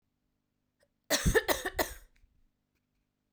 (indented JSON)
{
  "three_cough_length": "3.3 s",
  "three_cough_amplitude": 7159,
  "three_cough_signal_mean_std_ratio": 0.31,
  "survey_phase": "beta (2021-08-13 to 2022-03-07)",
  "age": "18-44",
  "gender": "Female",
  "wearing_mask": "No",
  "symptom_cough_any": true,
  "symptom_new_continuous_cough": true,
  "symptom_runny_or_blocked_nose": true,
  "symptom_shortness_of_breath": true,
  "symptom_fatigue": true,
  "symptom_headache": true,
  "symptom_onset": "2 days",
  "smoker_status": "Never smoked",
  "respiratory_condition_asthma": false,
  "respiratory_condition_other": false,
  "recruitment_source": "Test and Trace",
  "submission_delay": "2 days",
  "covid_test_result": "Positive",
  "covid_test_method": "RT-qPCR",
  "covid_ct_value": 27.4,
  "covid_ct_gene": "ORF1ab gene",
  "covid_ct_mean": 28.0,
  "covid_viral_load": "670 copies/ml",
  "covid_viral_load_category": "Minimal viral load (< 10K copies/ml)"
}